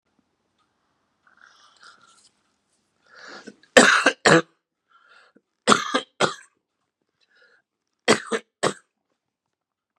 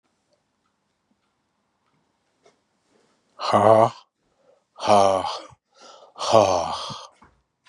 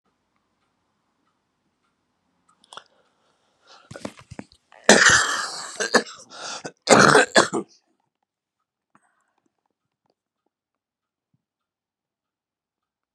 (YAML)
three_cough_length: 10.0 s
three_cough_amplitude: 32768
three_cough_signal_mean_std_ratio: 0.24
exhalation_length: 7.7 s
exhalation_amplitude: 29597
exhalation_signal_mean_std_ratio: 0.33
cough_length: 13.1 s
cough_amplitude: 32768
cough_signal_mean_std_ratio: 0.24
survey_phase: beta (2021-08-13 to 2022-03-07)
age: 65+
gender: Male
wearing_mask: 'No'
symptom_cough_any: true
symptom_new_continuous_cough: true
symptom_runny_or_blocked_nose: true
symptom_sore_throat: true
symptom_abdominal_pain: true
symptom_fatigue: true
symptom_fever_high_temperature: true
symptom_headache: true
symptom_onset: 7 days
smoker_status: Never smoked
respiratory_condition_asthma: false
respiratory_condition_other: false
recruitment_source: Test and Trace
submission_delay: 2 days
covid_test_result: Positive
covid_test_method: RT-qPCR
covid_ct_value: 26.6
covid_ct_gene: N gene